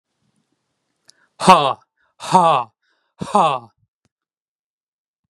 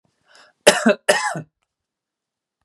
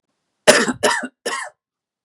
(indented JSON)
{
  "exhalation_length": "5.3 s",
  "exhalation_amplitude": 32768,
  "exhalation_signal_mean_std_ratio": 0.3,
  "cough_length": "2.6 s",
  "cough_amplitude": 32768,
  "cough_signal_mean_std_ratio": 0.3,
  "three_cough_length": "2.0 s",
  "three_cough_amplitude": 32768,
  "three_cough_signal_mean_std_ratio": 0.38,
  "survey_phase": "beta (2021-08-13 to 2022-03-07)",
  "age": "18-44",
  "gender": "Male",
  "wearing_mask": "No",
  "symptom_none": true,
  "smoker_status": "Never smoked",
  "respiratory_condition_asthma": true,
  "respiratory_condition_other": false,
  "recruitment_source": "REACT",
  "submission_delay": "2 days",
  "covid_test_result": "Negative",
  "covid_test_method": "RT-qPCR",
  "influenza_a_test_result": "Negative",
  "influenza_b_test_result": "Negative"
}